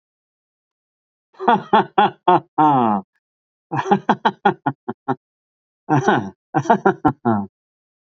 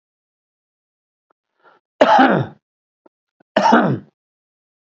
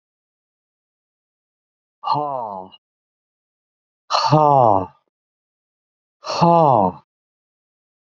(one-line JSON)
{"three_cough_length": "8.1 s", "three_cough_amplitude": 31352, "three_cough_signal_mean_std_ratio": 0.42, "cough_length": "4.9 s", "cough_amplitude": 27814, "cough_signal_mean_std_ratio": 0.33, "exhalation_length": "8.1 s", "exhalation_amplitude": 28902, "exhalation_signal_mean_std_ratio": 0.33, "survey_phase": "beta (2021-08-13 to 2022-03-07)", "age": "65+", "gender": "Male", "wearing_mask": "No", "symptom_none": true, "smoker_status": "Never smoked", "respiratory_condition_asthma": true, "respiratory_condition_other": false, "recruitment_source": "REACT", "submission_delay": "2 days", "covid_test_result": "Negative", "covid_test_method": "RT-qPCR", "influenza_a_test_result": "Negative", "influenza_b_test_result": "Negative"}